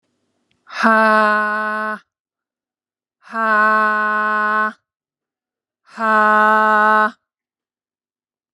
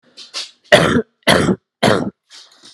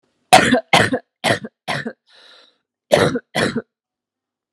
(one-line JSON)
{"exhalation_length": "8.5 s", "exhalation_amplitude": 32396, "exhalation_signal_mean_std_ratio": 0.52, "three_cough_length": "2.7 s", "three_cough_amplitude": 32768, "three_cough_signal_mean_std_ratio": 0.46, "cough_length": "4.5 s", "cough_amplitude": 32768, "cough_signal_mean_std_ratio": 0.39, "survey_phase": "alpha (2021-03-01 to 2021-08-12)", "age": "18-44", "gender": "Female", "wearing_mask": "No", "symptom_none": true, "smoker_status": "Ex-smoker", "respiratory_condition_asthma": false, "respiratory_condition_other": false, "recruitment_source": "REACT", "submission_delay": "2 days", "covid_test_result": "Negative", "covid_test_method": "RT-qPCR"}